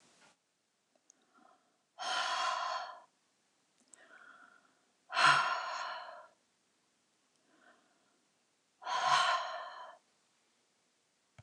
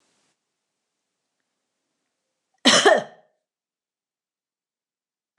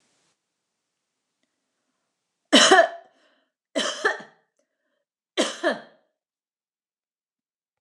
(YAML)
exhalation_length: 11.4 s
exhalation_amplitude: 6863
exhalation_signal_mean_std_ratio: 0.36
cough_length: 5.4 s
cough_amplitude: 29203
cough_signal_mean_std_ratio: 0.2
three_cough_length: 7.8 s
three_cough_amplitude: 26477
three_cough_signal_mean_std_ratio: 0.25
survey_phase: beta (2021-08-13 to 2022-03-07)
age: 45-64
gender: Female
wearing_mask: 'No'
symptom_cough_any: true
symptom_onset: 12 days
smoker_status: Never smoked
respiratory_condition_asthma: false
respiratory_condition_other: false
recruitment_source: REACT
submission_delay: 1 day
covid_test_result: Negative
covid_test_method: RT-qPCR
influenza_a_test_result: Negative
influenza_b_test_result: Negative